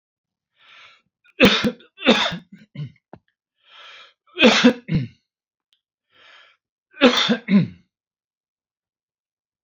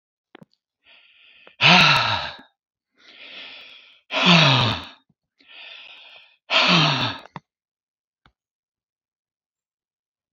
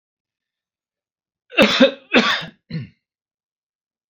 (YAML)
three_cough_length: 9.6 s
three_cough_amplitude: 31125
three_cough_signal_mean_std_ratio: 0.32
exhalation_length: 10.3 s
exhalation_amplitude: 28878
exhalation_signal_mean_std_ratio: 0.35
cough_length: 4.1 s
cough_amplitude: 31568
cough_signal_mean_std_ratio: 0.31
survey_phase: alpha (2021-03-01 to 2021-08-12)
age: 65+
gender: Male
wearing_mask: 'No'
symptom_none: true
smoker_status: Never smoked
respiratory_condition_asthma: false
respiratory_condition_other: false
recruitment_source: REACT
submission_delay: 2 days
covid_test_result: Negative
covid_test_method: RT-qPCR